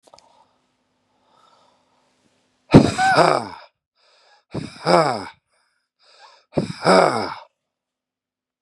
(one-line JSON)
{"exhalation_length": "8.6 s", "exhalation_amplitude": 32768, "exhalation_signal_mean_std_ratio": 0.31, "survey_phase": "beta (2021-08-13 to 2022-03-07)", "age": "45-64", "gender": "Male", "wearing_mask": "No", "symptom_none": true, "smoker_status": "Ex-smoker", "respiratory_condition_asthma": true, "respiratory_condition_other": true, "recruitment_source": "REACT", "submission_delay": "6 days", "covid_test_result": "Negative", "covid_test_method": "RT-qPCR", "influenza_a_test_result": "Negative", "influenza_b_test_result": "Negative"}